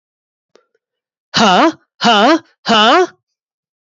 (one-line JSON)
{"exhalation_length": "3.8 s", "exhalation_amplitude": 32767, "exhalation_signal_mean_std_ratio": 0.47, "survey_phase": "beta (2021-08-13 to 2022-03-07)", "age": "18-44", "gender": "Male", "wearing_mask": "No", "symptom_none": true, "smoker_status": "Never smoked", "respiratory_condition_asthma": false, "respiratory_condition_other": false, "recruitment_source": "REACT", "submission_delay": "4 days", "covid_test_result": "Negative", "covid_test_method": "RT-qPCR", "influenza_a_test_result": "Negative", "influenza_b_test_result": "Negative"}